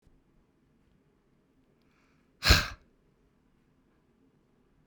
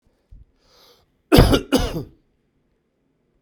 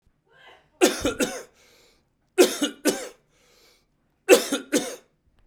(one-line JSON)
{"exhalation_length": "4.9 s", "exhalation_amplitude": 14083, "exhalation_signal_mean_std_ratio": 0.17, "cough_length": "3.4 s", "cough_amplitude": 32768, "cough_signal_mean_std_ratio": 0.29, "three_cough_length": "5.5 s", "three_cough_amplitude": 25870, "three_cough_signal_mean_std_ratio": 0.33, "survey_phase": "beta (2021-08-13 to 2022-03-07)", "age": "45-64", "gender": "Male", "wearing_mask": "No", "symptom_cough_any": true, "symptom_runny_or_blocked_nose": true, "symptom_fatigue": true, "symptom_loss_of_taste": true, "symptom_onset": "3 days", "smoker_status": "Never smoked", "respiratory_condition_asthma": false, "respiratory_condition_other": false, "recruitment_source": "Test and Trace", "submission_delay": "2 days", "covid_test_result": "Positive", "covid_test_method": "RT-qPCR", "covid_ct_value": 19.7, "covid_ct_gene": "ORF1ab gene"}